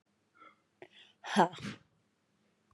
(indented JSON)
{
  "exhalation_length": "2.7 s",
  "exhalation_amplitude": 8956,
  "exhalation_signal_mean_std_ratio": 0.23,
  "survey_phase": "beta (2021-08-13 to 2022-03-07)",
  "age": "45-64",
  "gender": "Female",
  "wearing_mask": "No",
  "symptom_runny_or_blocked_nose": true,
  "symptom_fatigue": true,
  "symptom_onset": "12 days",
  "smoker_status": "Ex-smoker",
  "respiratory_condition_asthma": false,
  "respiratory_condition_other": false,
  "recruitment_source": "REACT",
  "submission_delay": "1 day",
  "covid_test_result": "Negative",
  "covid_test_method": "RT-qPCR",
  "influenza_a_test_result": "Negative",
  "influenza_b_test_result": "Negative"
}